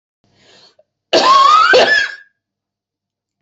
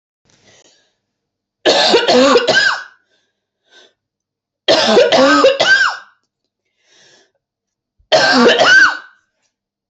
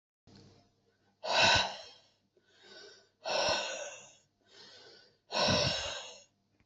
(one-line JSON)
{"cough_length": "3.4 s", "cough_amplitude": 30792, "cough_signal_mean_std_ratio": 0.49, "three_cough_length": "9.9 s", "three_cough_amplitude": 32359, "three_cough_signal_mean_std_ratio": 0.5, "exhalation_length": "6.7 s", "exhalation_amplitude": 7011, "exhalation_signal_mean_std_ratio": 0.43, "survey_phase": "beta (2021-08-13 to 2022-03-07)", "age": "45-64", "gender": "Female", "wearing_mask": "No", "symptom_cough_any": true, "symptom_runny_or_blocked_nose": true, "symptom_sore_throat": true, "symptom_abdominal_pain": true, "symptom_fatigue": true, "symptom_headache": true, "symptom_onset": "3 days", "smoker_status": "Never smoked", "respiratory_condition_asthma": false, "respiratory_condition_other": false, "recruitment_source": "REACT", "submission_delay": "2 days", "covid_test_result": "Negative", "covid_test_method": "RT-qPCR"}